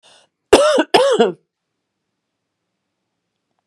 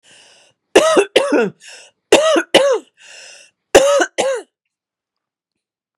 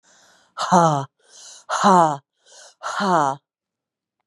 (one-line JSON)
{"cough_length": "3.7 s", "cough_amplitude": 32768, "cough_signal_mean_std_ratio": 0.34, "three_cough_length": "6.0 s", "three_cough_amplitude": 32768, "three_cough_signal_mean_std_ratio": 0.44, "exhalation_length": "4.3 s", "exhalation_amplitude": 25110, "exhalation_signal_mean_std_ratio": 0.43, "survey_phase": "beta (2021-08-13 to 2022-03-07)", "age": "45-64", "gender": "Female", "wearing_mask": "No", "symptom_cough_any": true, "symptom_runny_or_blocked_nose": true, "symptom_sore_throat": true, "symptom_fatigue": true, "symptom_onset": "2 days", "smoker_status": "Ex-smoker", "respiratory_condition_asthma": false, "respiratory_condition_other": false, "recruitment_source": "Test and Trace", "submission_delay": "1 day", "covid_test_result": "Positive", "covid_test_method": "RT-qPCR", "covid_ct_value": 14.0, "covid_ct_gene": "ORF1ab gene"}